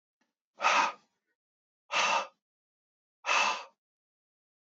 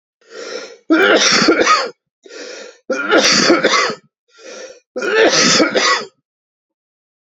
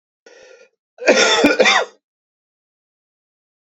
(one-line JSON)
{"exhalation_length": "4.8 s", "exhalation_amplitude": 7899, "exhalation_signal_mean_std_ratio": 0.36, "three_cough_length": "7.3 s", "three_cough_amplitude": 32768, "three_cough_signal_mean_std_ratio": 0.59, "cough_length": "3.7 s", "cough_amplitude": 29614, "cough_signal_mean_std_ratio": 0.38, "survey_phase": "beta (2021-08-13 to 2022-03-07)", "age": "45-64", "gender": "Male", "wearing_mask": "No", "symptom_cough_any": true, "symptom_runny_or_blocked_nose": true, "symptom_shortness_of_breath": true, "symptom_sore_throat": true, "symptom_headache": true, "symptom_change_to_sense_of_smell_or_taste": true, "smoker_status": "Never smoked", "respiratory_condition_asthma": true, "respiratory_condition_other": false, "recruitment_source": "Test and Trace", "submission_delay": "2 days", "covid_test_result": "Positive", "covid_test_method": "RT-qPCR", "covid_ct_value": 22.5, "covid_ct_gene": "N gene"}